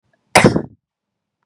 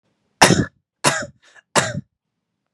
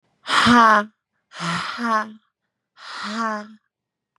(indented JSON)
{
  "cough_length": "1.5 s",
  "cough_amplitude": 32768,
  "cough_signal_mean_std_ratio": 0.29,
  "three_cough_length": "2.7 s",
  "three_cough_amplitude": 32768,
  "three_cough_signal_mean_std_ratio": 0.33,
  "exhalation_length": "4.2 s",
  "exhalation_amplitude": 27114,
  "exhalation_signal_mean_std_ratio": 0.45,
  "survey_phase": "beta (2021-08-13 to 2022-03-07)",
  "age": "18-44",
  "gender": "Female",
  "wearing_mask": "No",
  "symptom_runny_or_blocked_nose": true,
  "symptom_shortness_of_breath": true,
  "symptom_fatigue": true,
  "symptom_headache": true,
  "symptom_other": true,
  "symptom_onset": "9 days",
  "smoker_status": "Never smoked",
  "respiratory_condition_asthma": true,
  "respiratory_condition_other": false,
  "recruitment_source": "REACT",
  "submission_delay": "4 days",
  "covid_test_result": "Negative",
  "covid_test_method": "RT-qPCR",
  "influenza_a_test_result": "Negative",
  "influenza_b_test_result": "Negative"
}